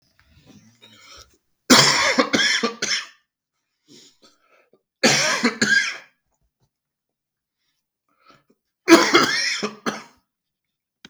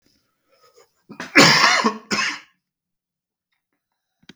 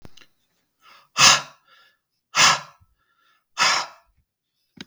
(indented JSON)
{
  "three_cough_length": "11.1 s",
  "three_cough_amplitude": 32768,
  "three_cough_signal_mean_std_ratio": 0.37,
  "cough_length": "4.4 s",
  "cough_amplitude": 32768,
  "cough_signal_mean_std_ratio": 0.33,
  "exhalation_length": "4.9 s",
  "exhalation_amplitude": 32768,
  "exhalation_signal_mean_std_ratio": 0.3,
  "survey_phase": "beta (2021-08-13 to 2022-03-07)",
  "age": "45-64",
  "gender": "Male",
  "wearing_mask": "No",
  "symptom_abdominal_pain": true,
  "symptom_onset": "12 days",
  "smoker_status": "Never smoked",
  "respiratory_condition_asthma": false,
  "respiratory_condition_other": false,
  "recruitment_source": "REACT",
  "submission_delay": "1 day",
  "covid_test_result": "Negative",
  "covid_test_method": "RT-qPCR"
}